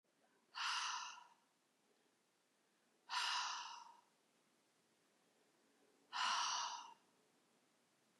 {
  "exhalation_length": "8.2 s",
  "exhalation_amplitude": 1260,
  "exhalation_signal_mean_std_ratio": 0.43,
  "survey_phase": "beta (2021-08-13 to 2022-03-07)",
  "age": "65+",
  "gender": "Female",
  "wearing_mask": "No",
  "symptom_none": true,
  "smoker_status": "Never smoked",
  "respiratory_condition_asthma": false,
  "respiratory_condition_other": false,
  "recruitment_source": "REACT",
  "submission_delay": "0 days",
  "covid_test_result": "Negative",
  "covid_test_method": "RT-qPCR",
  "influenza_a_test_result": "Negative",
  "influenza_b_test_result": "Negative"
}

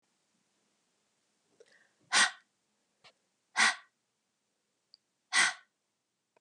{
  "exhalation_length": "6.4 s",
  "exhalation_amplitude": 8430,
  "exhalation_signal_mean_std_ratio": 0.23,
  "survey_phase": "beta (2021-08-13 to 2022-03-07)",
  "age": "45-64",
  "gender": "Female",
  "wearing_mask": "No",
  "symptom_cough_any": true,
  "symptom_fatigue": true,
  "symptom_headache": true,
  "symptom_onset": "4 days",
  "smoker_status": "Prefer not to say",
  "respiratory_condition_asthma": false,
  "respiratory_condition_other": false,
  "recruitment_source": "Test and Trace",
  "submission_delay": "2 days",
  "covid_test_result": "Positive",
  "covid_test_method": "RT-qPCR",
  "covid_ct_value": 18.0,
  "covid_ct_gene": "ORF1ab gene",
  "covid_ct_mean": 18.2,
  "covid_viral_load": "1100000 copies/ml",
  "covid_viral_load_category": "High viral load (>1M copies/ml)"
}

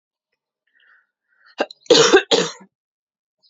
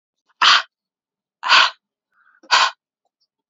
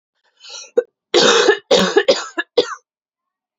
{
  "cough_length": "3.5 s",
  "cough_amplitude": 31669,
  "cough_signal_mean_std_ratio": 0.3,
  "exhalation_length": "3.5 s",
  "exhalation_amplitude": 30326,
  "exhalation_signal_mean_std_ratio": 0.34,
  "three_cough_length": "3.6 s",
  "three_cough_amplitude": 32767,
  "three_cough_signal_mean_std_ratio": 0.45,
  "survey_phase": "alpha (2021-03-01 to 2021-08-12)",
  "age": "18-44",
  "gender": "Female",
  "wearing_mask": "No",
  "symptom_shortness_of_breath": true,
  "symptom_fatigue": true,
  "symptom_headache": true,
  "symptom_change_to_sense_of_smell_or_taste": true,
  "symptom_loss_of_taste": true,
  "symptom_onset": "3 days",
  "smoker_status": "Never smoked",
  "respiratory_condition_asthma": false,
  "respiratory_condition_other": false,
  "recruitment_source": "Test and Trace",
  "submission_delay": "2 days",
  "covid_test_result": "Positive",
  "covid_test_method": "RT-qPCR",
  "covid_ct_value": 17.4,
  "covid_ct_gene": "ORF1ab gene",
  "covid_ct_mean": 18.3,
  "covid_viral_load": "1000000 copies/ml",
  "covid_viral_load_category": "High viral load (>1M copies/ml)"
}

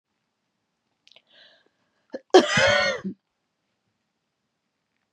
{
  "cough_length": "5.1 s",
  "cough_amplitude": 27330,
  "cough_signal_mean_std_ratio": 0.26,
  "survey_phase": "beta (2021-08-13 to 2022-03-07)",
  "age": "45-64",
  "gender": "Female",
  "wearing_mask": "No",
  "symptom_cough_any": true,
  "symptom_runny_or_blocked_nose": true,
  "symptom_shortness_of_breath": true,
  "symptom_sore_throat": true,
  "symptom_fatigue": true,
  "symptom_headache": true,
  "symptom_onset": "6 days",
  "smoker_status": "Never smoked",
  "respiratory_condition_asthma": false,
  "respiratory_condition_other": false,
  "recruitment_source": "Test and Trace",
  "submission_delay": "1 day",
  "covid_test_result": "Positive",
  "covid_test_method": "RT-qPCR",
  "covid_ct_value": 24.0,
  "covid_ct_gene": "N gene"
}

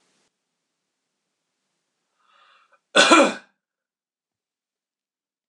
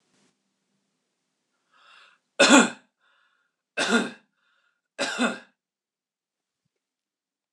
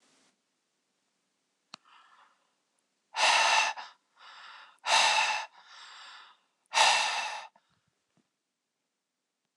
{
  "cough_length": "5.5 s",
  "cough_amplitude": 26028,
  "cough_signal_mean_std_ratio": 0.2,
  "three_cough_length": "7.5 s",
  "three_cough_amplitude": 26027,
  "three_cough_signal_mean_std_ratio": 0.24,
  "exhalation_length": "9.6 s",
  "exhalation_amplitude": 13452,
  "exhalation_signal_mean_std_ratio": 0.36,
  "survey_phase": "beta (2021-08-13 to 2022-03-07)",
  "age": "45-64",
  "gender": "Male",
  "wearing_mask": "No",
  "symptom_none": true,
  "smoker_status": "Never smoked",
  "respiratory_condition_asthma": false,
  "respiratory_condition_other": false,
  "recruitment_source": "REACT",
  "submission_delay": "2 days",
  "covid_test_result": "Negative",
  "covid_test_method": "RT-qPCR",
  "influenza_a_test_result": "Negative",
  "influenza_b_test_result": "Negative"
}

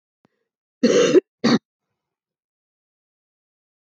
{
  "cough_length": "3.8 s",
  "cough_amplitude": 23237,
  "cough_signal_mean_std_ratio": 0.29,
  "survey_phase": "beta (2021-08-13 to 2022-03-07)",
  "age": "45-64",
  "gender": "Female",
  "wearing_mask": "No",
  "symptom_cough_any": true,
  "symptom_new_continuous_cough": true,
  "symptom_runny_or_blocked_nose": true,
  "symptom_sore_throat": true,
  "smoker_status": "Never smoked",
  "respiratory_condition_asthma": false,
  "respiratory_condition_other": false,
  "recruitment_source": "Test and Trace",
  "submission_delay": "2 days",
  "covid_test_result": "Positive",
  "covid_test_method": "RT-qPCR",
  "covid_ct_value": 14.8,
  "covid_ct_gene": "N gene"
}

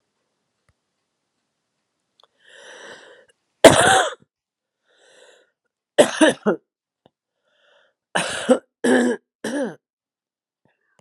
{
  "three_cough_length": "11.0 s",
  "three_cough_amplitude": 32768,
  "three_cough_signal_mean_std_ratio": 0.27,
  "survey_phase": "beta (2021-08-13 to 2022-03-07)",
  "age": "65+",
  "gender": "Female",
  "wearing_mask": "No",
  "symptom_cough_any": true,
  "symptom_runny_or_blocked_nose": true,
  "symptom_fatigue": true,
  "symptom_fever_high_temperature": true,
  "symptom_change_to_sense_of_smell_or_taste": true,
  "symptom_onset": "5 days",
  "smoker_status": "Never smoked",
  "respiratory_condition_asthma": true,
  "respiratory_condition_other": false,
  "recruitment_source": "Test and Trace",
  "submission_delay": "2 days",
  "covid_test_result": "Positive",
  "covid_test_method": "RT-qPCR",
  "covid_ct_value": 25.9,
  "covid_ct_gene": "ORF1ab gene"
}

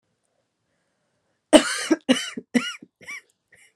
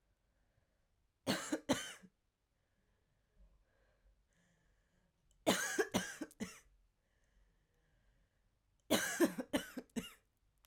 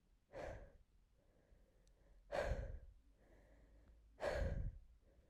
{
  "cough_length": "3.8 s",
  "cough_amplitude": 32767,
  "cough_signal_mean_std_ratio": 0.27,
  "three_cough_length": "10.7 s",
  "three_cough_amplitude": 4853,
  "three_cough_signal_mean_std_ratio": 0.31,
  "exhalation_length": "5.3 s",
  "exhalation_amplitude": 1042,
  "exhalation_signal_mean_std_ratio": 0.47,
  "survey_phase": "alpha (2021-03-01 to 2021-08-12)",
  "age": "18-44",
  "gender": "Female",
  "wearing_mask": "No",
  "symptom_cough_any": true,
  "symptom_shortness_of_breath": true,
  "symptom_fatigue": true,
  "symptom_fever_high_temperature": true,
  "symptom_headache": true,
  "smoker_status": "Ex-smoker",
  "respiratory_condition_asthma": true,
  "respiratory_condition_other": false,
  "recruitment_source": "Test and Trace",
  "submission_delay": "1 day",
  "covid_test_result": "Positive",
  "covid_test_method": "RT-qPCR",
  "covid_ct_value": 31.4,
  "covid_ct_gene": "N gene"
}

